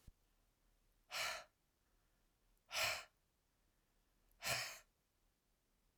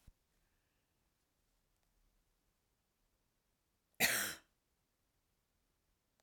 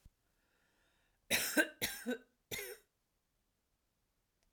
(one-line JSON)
{"exhalation_length": "6.0 s", "exhalation_amplitude": 1292, "exhalation_signal_mean_std_ratio": 0.33, "cough_length": "6.2 s", "cough_amplitude": 4010, "cough_signal_mean_std_ratio": 0.18, "three_cough_length": "4.5 s", "three_cough_amplitude": 3950, "three_cough_signal_mean_std_ratio": 0.31, "survey_phase": "alpha (2021-03-01 to 2021-08-12)", "age": "45-64", "gender": "Female", "wearing_mask": "No", "symptom_cough_any": true, "symptom_fatigue": true, "smoker_status": "Never smoked", "respiratory_condition_asthma": false, "respiratory_condition_other": false, "recruitment_source": "REACT", "submission_delay": "4 days", "covid_test_result": "Negative", "covid_test_method": "RT-qPCR"}